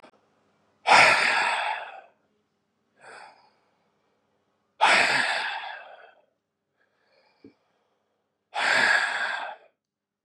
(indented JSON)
{
  "exhalation_length": "10.2 s",
  "exhalation_amplitude": 23730,
  "exhalation_signal_mean_std_ratio": 0.4,
  "survey_phase": "beta (2021-08-13 to 2022-03-07)",
  "age": "18-44",
  "gender": "Male",
  "wearing_mask": "Yes",
  "symptom_cough_any": true,
  "symptom_runny_or_blocked_nose": true,
  "symptom_sore_throat": true,
  "symptom_other": true,
  "symptom_onset": "2 days",
  "smoker_status": "Never smoked",
  "respiratory_condition_asthma": false,
  "respiratory_condition_other": false,
  "recruitment_source": "Test and Trace",
  "submission_delay": "1 day",
  "covid_test_result": "Positive",
  "covid_test_method": "RT-qPCR",
  "covid_ct_value": 20.5,
  "covid_ct_gene": "N gene"
}